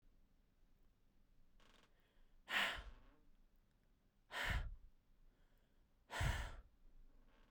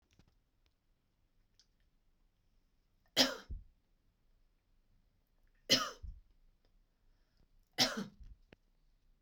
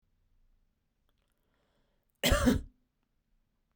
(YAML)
exhalation_length: 7.5 s
exhalation_amplitude: 1568
exhalation_signal_mean_std_ratio: 0.39
three_cough_length: 9.2 s
three_cough_amplitude: 8227
three_cough_signal_mean_std_ratio: 0.22
cough_length: 3.8 s
cough_amplitude: 6987
cough_signal_mean_std_ratio: 0.25
survey_phase: beta (2021-08-13 to 2022-03-07)
age: 18-44
gender: Female
wearing_mask: 'No'
symptom_none: true
smoker_status: Current smoker (1 to 10 cigarettes per day)
respiratory_condition_asthma: false
respiratory_condition_other: false
recruitment_source: REACT
submission_delay: 1 day
covid_test_result: Negative
covid_test_method: RT-qPCR